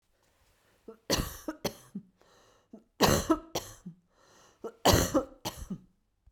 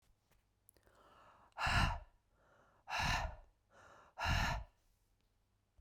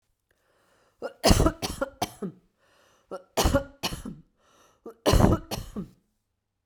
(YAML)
three_cough_length: 6.3 s
three_cough_amplitude: 11224
three_cough_signal_mean_std_ratio: 0.35
exhalation_length: 5.8 s
exhalation_amplitude: 2573
exhalation_signal_mean_std_ratio: 0.41
cough_length: 6.7 s
cough_amplitude: 23637
cough_signal_mean_std_ratio: 0.35
survey_phase: beta (2021-08-13 to 2022-03-07)
age: 45-64
gender: Female
wearing_mask: 'No'
symptom_cough_any: true
symptom_runny_or_blocked_nose: true
symptom_change_to_sense_of_smell_or_taste: true
symptom_loss_of_taste: true
symptom_onset: 8 days
smoker_status: Never smoked
respiratory_condition_asthma: false
respiratory_condition_other: false
recruitment_source: Test and Trace
submission_delay: 2 days
covid_test_result: Positive
covid_test_method: RT-qPCR